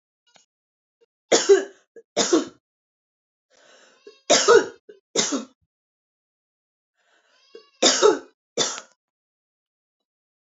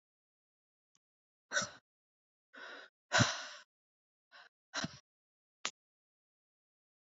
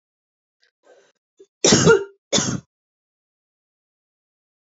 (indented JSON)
{
  "three_cough_length": "10.6 s",
  "three_cough_amplitude": 25749,
  "three_cough_signal_mean_std_ratio": 0.29,
  "exhalation_length": "7.2 s",
  "exhalation_amplitude": 5375,
  "exhalation_signal_mean_std_ratio": 0.22,
  "cough_length": "4.6 s",
  "cough_amplitude": 26610,
  "cough_signal_mean_std_ratio": 0.28,
  "survey_phase": "beta (2021-08-13 to 2022-03-07)",
  "age": "18-44",
  "gender": "Female",
  "wearing_mask": "No",
  "symptom_none": true,
  "symptom_onset": "8 days",
  "smoker_status": "Ex-smoker",
  "respiratory_condition_asthma": false,
  "respiratory_condition_other": false,
  "recruitment_source": "REACT",
  "submission_delay": "3 days",
  "covid_test_result": "Negative",
  "covid_test_method": "RT-qPCR",
  "influenza_a_test_result": "Negative",
  "influenza_b_test_result": "Negative"
}